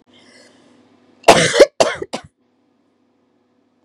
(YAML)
three_cough_length: 3.8 s
three_cough_amplitude: 32768
three_cough_signal_mean_std_ratio: 0.27
survey_phase: beta (2021-08-13 to 2022-03-07)
age: 45-64
gender: Female
wearing_mask: 'No'
symptom_cough_any: true
symptom_onset: 4 days
smoker_status: Current smoker (e-cigarettes or vapes only)
respiratory_condition_asthma: false
respiratory_condition_other: false
recruitment_source: Test and Trace
submission_delay: 2 days
covid_test_result: Positive
covid_test_method: RT-qPCR